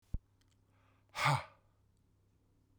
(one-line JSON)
{"exhalation_length": "2.8 s", "exhalation_amplitude": 4015, "exhalation_signal_mean_std_ratio": 0.27, "survey_phase": "beta (2021-08-13 to 2022-03-07)", "age": "45-64", "gender": "Male", "wearing_mask": "No", "symptom_cough_any": true, "symptom_runny_or_blocked_nose": true, "symptom_shortness_of_breath": true, "symptom_sore_throat": true, "symptom_fatigue": true, "symptom_fever_high_temperature": true, "symptom_headache": true, "symptom_change_to_sense_of_smell_or_taste": true, "symptom_other": true, "smoker_status": "Never smoked", "respiratory_condition_asthma": true, "respiratory_condition_other": false, "recruitment_source": "Test and Trace", "submission_delay": "1 day", "covid_test_result": "Positive", "covid_test_method": "RT-qPCR"}